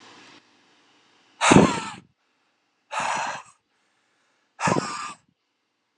{"exhalation_length": "6.0 s", "exhalation_amplitude": 32213, "exhalation_signal_mean_std_ratio": 0.3, "survey_phase": "alpha (2021-03-01 to 2021-08-12)", "age": "18-44", "gender": "Male", "wearing_mask": "No", "symptom_cough_any": true, "symptom_fatigue": true, "symptom_change_to_sense_of_smell_or_taste": true, "symptom_loss_of_taste": true, "symptom_onset": "3 days", "smoker_status": "Never smoked", "respiratory_condition_asthma": false, "respiratory_condition_other": false, "recruitment_source": "Test and Trace", "submission_delay": "1 day", "covid_test_result": "Positive", "covid_test_method": "RT-qPCR", "covid_ct_value": 22.8, "covid_ct_gene": "ORF1ab gene"}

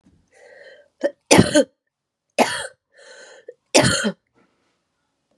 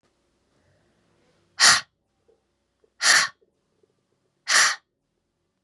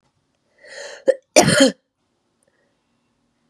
{"three_cough_length": "5.4 s", "three_cough_amplitude": 32768, "three_cough_signal_mean_std_ratio": 0.31, "exhalation_length": "5.6 s", "exhalation_amplitude": 29588, "exhalation_signal_mean_std_ratio": 0.28, "cough_length": "3.5 s", "cough_amplitude": 32768, "cough_signal_mean_std_ratio": 0.27, "survey_phase": "beta (2021-08-13 to 2022-03-07)", "age": "18-44", "gender": "Female", "wearing_mask": "No", "symptom_cough_any": true, "symptom_new_continuous_cough": true, "symptom_runny_or_blocked_nose": true, "symptom_sore_throat": true, "symptom_onset": "2 days", "smoker_status": "Never smoked", "respiratory_condition_asthma": false, "respiratory_condition_other": false, "recruitment_source": "Test and Trace", "submission_delay": "1 day", "covid_test_result": "Negative", "covid_test_method": "RT-qPCR"}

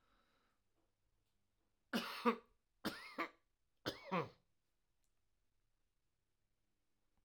{"three_cough_length": "7.2 s", "three_cough_amplitude": 2807, "three_cough_signal_mean_std_ratio": 0.26, "survey_phase": "alpha (2021-03-01 to 2021-08-12)", "age": "65+", "gender": "Male", "wearing_mask": "No", "symptom_none": true, "smoker_status": "Never smoked", "respiratory_condition_asthma": false, "respiratory_condition_other": false, "recruitment_source": "REACT", "submission_delay": "2 days", "covid_test_result": "Negative", "covid_test_method": "RT-qPCR"}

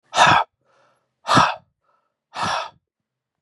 {"exhalation_length": "3.4 s", "exhalation_amplitude": 31908, "exhalation_signal_mean_std_ratio": 0.37, "survey_phase": "beta (2021-08-13 to 2022-03-07)", "age": "45-64", "gender": "Male", "wearing_mask": "No", "symptom_cough_any": true, "symptom_runny_or_blocked_nose": true, "symptom_fever_high_temperature": true, "smoker_status": "Never smoked", "respiratory_condition_asthma": false, "respiratory_condition_other": false, "recruitment_source": "Test and Trace", "submission_delay": "2 days", "covid_test_result": "Positive", "covid_test_method": "RT-qPCR", "covid_ct_value": 30.4, "covid_ct_gene": "N gene"}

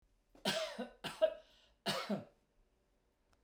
{"three_cough_length": "3.4 s", "three_cough_amplitude": 3442, "three_cough_signal_mean_std_ratio": 0.4, "survey_phase": "beta (2021-08-13 to 2022-03-07)", "age": "65+", "gender": "Male", "wearing_mask": "No", "symptom_none": true, "smoker_status": "Never smoked", "respiratory_condition_asthma": false, "respiratory_condition_other": false, "recruitment_source": "REACT", "submission_delay": "1 day", "covid_test_result": "Negative", "covid_test_method": "RT-qPCR"}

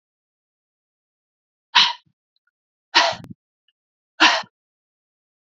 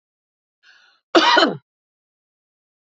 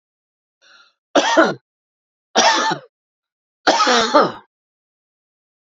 {"exhalation_length": "5.5 s", "exhalation_amplitude": 30373, "exhalation_signal_mean_std_ratio": 0.24, "cough_length": "3.0 s", "cough_amplitude": 29815, "cough_signal_mean_std_ratio": 0.29, "three_cough_length": "5.7 s", "three_cough_amplitude": 31937, "three_cough_signal_mean_std_ratio": 0.4, "survey_phase": "beta (2021-08-13 to 2022-03-07)", "age": "45-64", "gender": "Female", "wearing_mask": "No", "symptom_none": true, "smoker_status": "Never smoked", "respiratory_condition_asthma": true, "respiratory_condition_other": false, "recruitment_source": "Test and Trace", "submission_delay": "3 days", "covid_test_result": "Negative", "covid_test_method": "ePCR"}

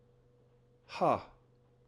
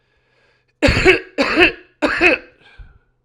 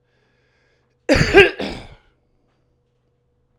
{"exhalation_length": "1.9 s", "exhalation_amplitude": 4939, "exhalation_signal_mean_std_ratio": 0.3, "three_cough_length": "3.2 s", "three_cough_amplitude": 32768, "three_cough_signal_mean_std_ratio": 0.46, "cough_length": "3.6 s", "cough_amplitude": 32768, "cough_signal_mean_std_ratio": 0.27, "survey_phase": "alpha (2021-03-01 to 2021-08-12)", "age": "45-64", "gender": "Male", "wearing_mask": "No", "symptom_none": true, "symptom_cough_any": true, "smoker_status": "Never smoked", "respiratory_condition_asthma": true, "respiratory_condition_other": false, "recruitment_source": "REACT", "submission_delay": "1 day", "covid_test_result": "Negative", "covid_test_method": "RT-qPCR"}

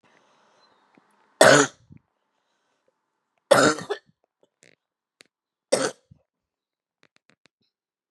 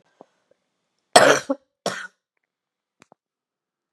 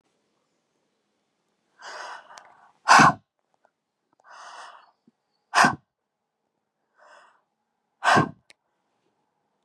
{"three_cough_length": "8.1 s", "three_cough_amplitude": 32083, "three_cough_signal_mean_std_ratio": 0.22, "cough_length": "3.9 s", "cough_amplitude": 32768, "cough_signal_mean_std_ratio": 0.21, "exhalation_length": "9.6 s", "exhalation_amplitude": 24732, "exhalation_signal_mean_std_ratio": 0.22, "survey_phase": "beta (2021-08-13 to 2022-03-07)", "age": "45-64", "gender": "Female", "wearing_mask": "No", "symptom_cough_any": true, "symptom_runny_or_blocked_nose": true, "symptom_sore_throat": true, "symptom_headache": true, "symptom_onset": "4 days", "smoker_status": "Ex-smoker", "respiratory_condition_asthma": false, "respiratory_condition_other": false, "recruitment_source": "Test and Trace", "submission_delay": "2 days", "covid_test_result": "Positive", "covid_test_method": "ePCR"}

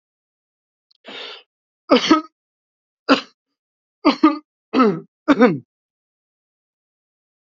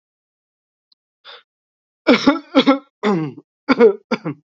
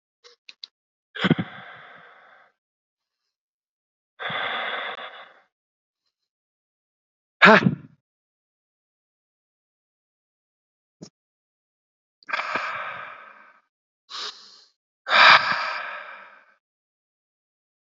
{"three_cough_length": "7.6 s", "three_cough_amplitude": 31700, "three_cough_signal_mean_std_ratio": 0.29, "cough_length": "4.5 s", "cough_amplitude": 30596, "cough_signal_mean_std_ratio": 0.37, "exhalation_length": "17.9 s", "exhalation_amplitude": 28949, "exhalation_signal_mean_std_ratio": 0.24, "survey_phase": "beta (2021-08-13 to 2022-03-07)", "age": "18-44", "gender": "Male", "wearing_mask": "No", "symptom_cough_any": true, "symptom_runny_or_blocked_nose": true, "symptom_shortness_of_breath": true, "symptom_sore_throat": true, "symptom_abdominal_pain": true, "symptom_diarrhoea": true, "symptom_fatigue": true, "symptom_fever_high_temperature": true, "symptom_headache": true, "symptom_onset": "2 days", "smoker_status": "Current smoker (1 to 10 cigarettes per day)", "respiratory_condition_asthma": false, "respiratory_condition_other": false, "recruitment_source": "Test and Trace", "submission_delay": "2 days", "covid_test_result": "Positive", "covid_test_method": "RT-qPCR", "covid_ct_value": 15.4, "covid_ct_gene": "ORF1ab gene", "covid_ct_mean": 15.7, "covid_viral_load": "7100000 copies/ml", "covid_viral_load_category": "High viral load (>1M copies/ml)"}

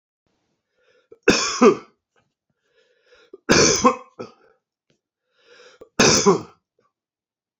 {"three_cough_length": "7.6 s", "three_cough_amplitude": 27746, "three_cough_signal_mean_std_ratio": 0.32, "survey_phase": "beta (2021-08-13 to 2022-03-07)", "age": "45-64", "gender": "Male", "wearing_mask": "No", "symptom_none": true, "smoker_status": "Never smoked", "respiratory_condition_asthma": false, "respiratory_condition_other": false, "recruitment_source": "REACT", "submission_delay": "1 day", "covid_test_result": "Negative", "covid_test_method": "RT-qPCR", "influenza_a_test_result": "Negative", "influenza_b_test_result": "Negative"}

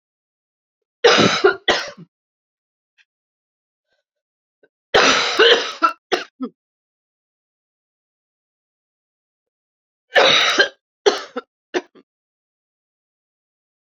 {"three_cough_length": "13.8 s", "three_cough_amplitude": 31374, "three_cough_signal_mean_std_ratio": 0.31, "survey_phase": "beta (2021-08-13 to 2022-03-07)", "age": "45-64", "gender": "Female", "wearing_mask": "No", "symptom_cough_any": true, "symptom_shortness_of_breath": true, "symptom_sore_throat": true, "symptom_fatigue": true, "symptom_onset": "3 days", "smoker_status": "Ex-smoker", "respiratory_condition_asthma": false, "respiratory_condition_other": false, "recruitment_source": "Test and Trace", "submission_delay": "2 days", "covid_test_result": "Positive", "covid_test_method": "ePCR"}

